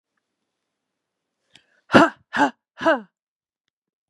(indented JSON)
{
  "exhalation_length": "4.1 s",
  "exhalation_amplitude": 32767,
  "exhalation_signal_mean_std_ratio": 0.24,
  "survey_phase": "beta (2021-08-13 to 2022-03-07)",
  "age": "45-64",
  "gender": "Female",
  "wearing_mask": "No",
  "symptom_cough_any": true,
  "symptom_runny_or_blocked_nose": true,
  "symptom_fatigue": true,
  "smoker_status": "Never smoked",
  "respiratory_condition_asthma": false,
  "respiratory_condition_other": false,
  "recruitment_source": "Test and Trace",
  "submission_delay": "2 days",
  "covid_test_result": "Positive",
  "covid_test_method": "LFT"
}